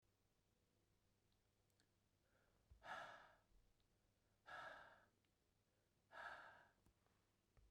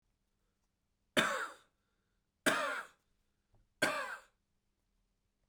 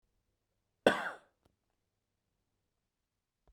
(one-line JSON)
{"exhalation_length": "7.7 s", "exhalation_amplitude": 251, "exhalation_signal_mean_std_ratio": 0.43, "three_cough_length": "5.5 s", "three_cough_amplitude": 6009, "three_cough_signal_mean_std_ratio": 0.32, "cough_length": "3.5 s", "cough_amplitude": 9600, "cough_signal_mean_std_ratio": 0.16, "survey_phase": "beta (2021-08-13 to 2022-03-07)", "age": "45-64", "gender": "Male", "wearing_mask": "No", "symptom_cough_any": true, "symptom_new_continuous_cough": true, "symptom_runny_or_blocked_nose": true, "symptom_headache": true, "smoker_status": "Never smoked", "respiratory_condition_asthma": false, "respiratory_condition_other": false, "recruitment_source": "Test and Trace", "submission_delay": "1 day", "covid_test_result": "Positive", "covid_test_method": "RT-qPCR", "covid_ct_value": 19.3, "covid_ct_gene": "ORF1ab gene", "covid_ct_mean": 19.9, "covid_viral_load": "290000 copies/ml", "covid_viral_load_category": "Low viral load (10K-1M copies/ml)"}